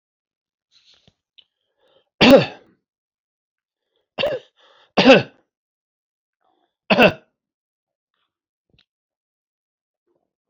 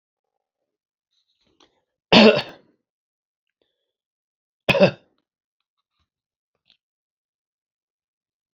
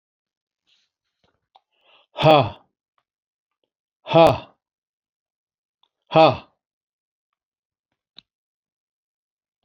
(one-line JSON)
{"three_cough_length": "10.5 s", "three_cough_amplitude": 30024, "three_cough_signal_mean_std_ratio": 0.21, "cough_length": "8.5 s", "cough_amplitude": 29460, "cough_signal_mean_std_ratio": 0.18, "exhalation_length": "9.6 s", "exhalation_amplitude": 28002, "exhalation_signal_mean_std_ratio": 0.21, "survey_phase": "alpha (2021-03-01 to 2021-08-12)", "age": "65+", "gender": "Male", "wearing_mask": "No", "symptom_none": true, "smoker_status": "Ex-smoker", "respiratory_condition_asthma": false, "respiratory_condition_other": false, "recruitment_source": "REACT", "submission_delay": "1 day", "covid_test_result": "Negative", "covid_test_method": "RT-qPCR"}